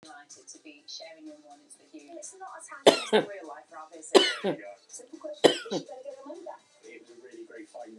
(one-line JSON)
{"three_cough_length": "8.0 s", "three_cough_amplitude": 25229, "three_cough_signal_mean_std_ratio": 0.31, "survey_phase": "beta (2021-08-13 to 2022-03-07)", "age": "45-64", "gender": "Female", "wearing_mask": "No", "symptom_none": true, "smoker_status": "Never smoked", "respiratory_condition_asthma": false, "respiratory_condition_other": false, "recruitment_source": "REACT", "submission_delay": "2 days", "covid_test_result": "Negative", "covid_test_method": "RT-qPCR"}